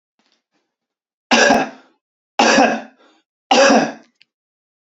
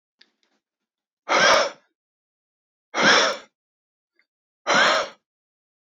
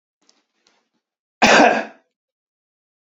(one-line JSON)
{"three_cough_length": "4.9 s", "three_cough_amplitude": 31294, "three_cough_signal_mean_std_ratio": 0.4, "exhalation_length": "5.9 s", "exhalation_amplitude": 22063, "exhalation_signal_mean_std_ratio": 0.36, "cough_length": "3.2 s", "cough_amplitude": 28203, "cough_signal_mean_std_ratio": 0.28, "survey_phase": "beta (2021-08-13 to 2022-03-07)", "age": "18-44", "gender": "Male", "wearing_mask": "No", "symptom_none": true, "smoker_status": "Never smoked", "respiratory_condition_asthma": false, "respiratory_condition_other": false, "recruitment_source": "REACT", "submission_delay": "1 day", "covid_test_result": "Negative", "covid_test_method": "RT-qPCR", "influenza_a_test_result": "Negative", "influenza_b_test_result": "Negative"}